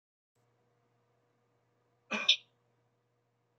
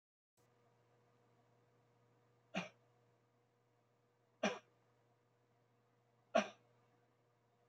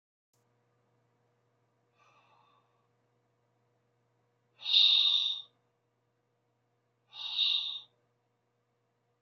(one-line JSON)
{"cough_length": "3.6 s", "cough_amplitude": 9834, "cough_signal_mean_std_ratio": 0.17, "three_cough_length": "7.7 s", "three_cough_amplitude": 3021, "three_cough_signal_mean_std_ratio": 0.18, "exhalation_length": "9.2 s", "exhalation_amplitude": 7566, "exhalation_signal_mean_std_ratio": 0.29, "survey_phase": "beta (2021-08-13 to 2022-03-07)", "age": "45-64", "gender": "Male", "wearing_mask": "No", "symptom_none": true, "smoker_status": "Never smoked", "respiratory_condition_asthma": false, "respiratory_condition_other": false, "recruitment_source": "REACT", "submission_delay": "1 day", "covid_test_result": "Negative", "covid_test_method": "RT-qPCR"}